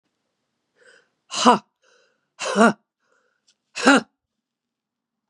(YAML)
exhalation_length: 5.3 s
exhalation_amplitude: 32156
exhalation_signal_mean_std_ratio: 0.26
survey_phase: beta (2021-08-13 to 2022-03-07)
age: 65+
gender: Female
wearing_mask: 'No'
symptom_none: true
smoker_status: Never smoked
respiratory_condition_asthma: true
respiratory_condition_other: false
recruitment_source: REACT
submission_delay: 1 day
covid_test_result: Negative
covid_test_method: RT-qPCR
influenza_a_test_result: Negative
influenza_b_test_result: Negative